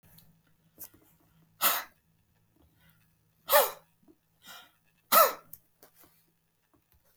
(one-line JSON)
{"exhalation_length": "7.2 s", "exhalation_amplitude": 13786, "exhalation_signal_mean_std_ratio": 0.23, "survey_phase": "beta (2021-08-13 to 2022-03-07)", "age": "65+", "gender": "Male", "wearing_mask": "No", "symptom_none": true, "smoker_status": "Never smoked", "respiratory_condition_asthma": false, "respiratory_condition_other": false, "recruitment_source": "REACT", "submission_delay": "0 days", "covid_test_result": "Negative", "covid_test_method": "RT-qPCR", "influenza_a_test_result": "Negative", "influenza_b_test_result": "Negative"}